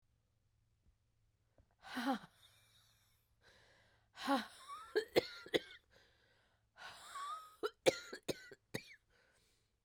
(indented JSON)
{
  "exhalation_length": "9.8 s",
  "exhalation_amplitude": 5372,
  "exhalation_signal_mean_std_ratio": 0.29,
  "survey_phase": "beta (2021-08-13 to 2022-03-07)",
  "age": "45-64",
  "gender": "Female",
  "wearing_mask": "No",
  "symptom_cough_any": true,
  "symptom_new_continuous_cough": true,
  "symptom_runny_or_blocked_nose": true,
  "symptom_shortness_of_breath": true,
  "symptom_abdominal_pain": true,
  "symptom_fatigue": true,
  "symptom_headache": true,
  "symptom_change_to_sense_of_smell_or_taste": true,
  "symptom_loss_of_taste": true,
  "symptom_onset": "4 days",
  "smoker_status": "Ex-smoker",
  "respiratory_condition_asthma": false,
  "respiratory_condition_other": false,
  "recruitment_source": "Test and Trace",
  "submission_delay": "1 day",
  "covid_test_result": "Positive",
  "covid_test_method": "RT-qPCR",
  "covid_ct_value": 16.7,
  "covid_ct_gene": "ORF1ab gene",
  "covid_ct_mean": 17.1,
  "covid_viral_load": "2600000 copies/ml",
  "covid_viral_load_category": "High viral load (>1M copies/ml)"
}